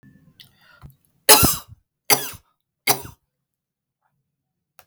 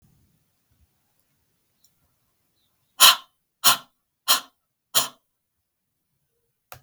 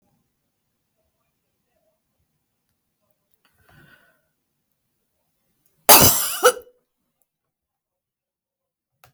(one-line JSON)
{"three_cough_length": "4.9 s", "three_cough_amplitude": 32768, "three_cough_signal_mean_std_ratio": 0.24, "exhalation_length": "6.8 s", "exhalation_amplitude": 32768, "exhalation_signal_mean_std_ratio": 0.19, "cough_length": "9.1 s", "cough_amplitude": 32768, "cough_signal_mean_std_ratio": 0.18, "survey_phase": "beta (2021-08-13 to 2022-03-07)", "age": "45-64", "gender": "Female", "wearing_mask": "No", "symptom_none": true, "smoker_status": "Never smoked", "respiratory_condition_asthma": false, "respiratory_condition_other": false, "recruitment_source": "REACT", "submission_delay": "2 days", "covid_test_result": "Negative", "covid_test_method": "RT-qPCR"}